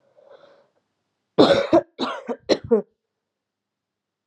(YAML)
three_cough_length: 4.3 s
three_cough_amplitude: 30527
three_cough_signal_mean_std_ratio: 0.31
survey_phase: beta (2021-08-13 to 2022-03-07)
age: 18-44
gender: Female
wearing_mask: 'No'
symptom_cough_any: true
symptom_new_continuous_cough: true
symptom_runny_or_blocked_nose: true
symptom_shortness_of_breath: true
symptom_fatigue: true
symptom_headache: true
symptom_other: true
symptom_onset: 5 days
smoker_status: Ex-smoker
respiratory_condition_asthma: false
respiratory_condition_other: false
recruitment_source: Test and Trace
submission_delay: 1 day
covid_test_result: Positive
covid_test_method: RT-qPCR
covid_ct_value: 20.3
covid_ct_gene: ORF1ab gene
covid_ct_mean: 20.6
covid_viral_load: 170000 copies/ml
covid_viral_load_category: Low viral load (10K-1M copies/ml)